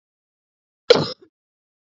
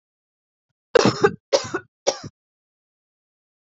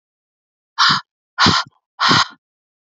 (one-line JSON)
{"cough_length": "2.0 s", "cough_amplitude": 30633, "cough_signal_mean_std_ratio": 0.19, "three_cough_length": "3.8 s", "three_cough_amplitude": 27713, "three_cough_signal_mean_std_ratio": 0.26, "exhalation_length": "3.0 s", "exhalation_amplitude": 32768, "exhalation_signal_mean_std_ratio": 0.4, "survey_phase": "alpha (2021-03-01 to 2021-08-12)", "age": "18-44", "gender": "Female", "wearing_mask": "No", "symptom_cough_any": true, "symptom_new_continuous_cough": true, "symptom_fatigue": true, "symptom_fever_high_temperature": true, "symptom_headache": true, "symptom_change_to_sense_of_smell_or_taste": true, "symptom_loss_of_taste": true, "symptom_onset": "5 days", "smoker_status": "Current smoker (1 to 10 cigarettes per day)", "respiratory_condition_asthma": false, "respiratory_condition_other": false, "recruitment_source": "Test and Trace", "submission_delay": "2 days", "covid_test_result": "Positive", "covid_test_method": "RT-qPCR", "covid_ct_value": 19.3, "covid_ct_gene": "ORF1ab gene"}